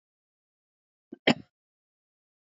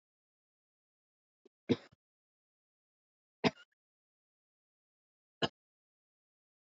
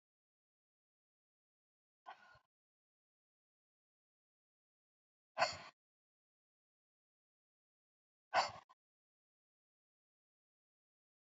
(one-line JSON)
{"cough_length": "2.5 s", "cough_amplitude": 14633, "cough_signal_mean_std_ratio": 0.13, "three_cough_length": "6.7 s", "three_cough_amplitude": 5633, "three_cough_signal_mean_std_ratio": 0.12, "exhalation_length": "11.3 s", "exhalation_amplitude": 3198, "exhalation_signal_mean_std_ratio": 0.13, "survey_phase": "beta (2021-08-13 to 2022-03-07)", "age": "45-64", "gender": "Female", "wearing_mask": "No", "symptom_none": true, "smoker_status": "Never smoked", "respiratory_condition_asthma": false, "respiratory_condition_other": false, "recruitment_source": "REACT", "submission_delay": "1 day", "covid_test_result": "Negative", "covid_test_method": "RT-qPCR", "influenza_a_test_result": "Negative", "influenza_b_test_result": "Negative"}